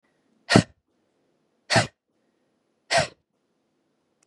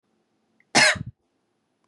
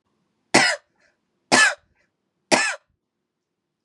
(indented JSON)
{
  "exhalation_length": "4.3 s",
  "exhalation_amplitude": 32746,
  "exhalation_signal_mean_std_ratio": 0.22,
  "cough_length": "1.9 s",
  "cough_amplitude": 22858,
  "cough_signal_mean_std_ratio": 0.28,
  "three_cough_length": "3.8 s",
  "three_cough_amplitude": 32013,
  "three_cough_signal_mean_std_ratio": 0.31,
  "survey_phase": "beta (2021-08-13 to 2022-03-07)",
  "age": "18-44",
  "gender": "Female",
  "wearing_mask": "No",
  "symptom_other": true,
  "symptom_onset": "2 days",
  "smoker_status": "Never smoked",
  "respiratory_condition_asthma": false,
  "respiratory_condition_other": false,
  "recruitment_source": "Test and Trace",
  "submission_delay": "1 day",
  "covid_test_result": "Positive",
  "covid_test_method": "RT-qPCR",
  "covid_ct_value": 16.9,
  "covid_ct_gene": "ORF1ab gene",
  "covid_ct_mean": 17.3,
  "covid_viral_load": "2100000 copies/ml",
  "covid_viral_load_category": "High viral load (>1M copies/ml)"
}